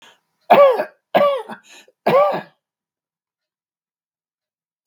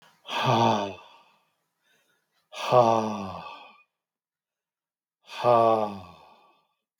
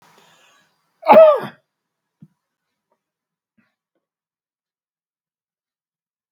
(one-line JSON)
{"three_cough_length": "4.9 s", "three_cough_amplitude": 32768, "three_cough_signal_mean_std_ratio": 0.35, "exhalation_length": "7.0 s", "exhalation_amplitude": 17148, "exhalation_signal_mean_std_ratio": 0.39, "cough_length": "6.3 s", "cough_amplitude": 32768, "cough_signal_mean_std_ratio": 0.19, "survey_phase": "beta (2021-08-13 to 2022-03-07)", "age": "65+", "gender": "Male", "wearing_mask": "No", "symptom_runny_or_blocked_nose": true, "smoker_status": "Never smoked", "respiratory_condition_asthma": false, "respiratory_condition_other": false, "recruitment_source": "REACT", "submission_delay": "4 days", "covid_test_result": "Negative", "covid_test_method": "RT-qPCR", "influenza_a_test_result": "Negative", "influenza_b_test_result": "Negative"}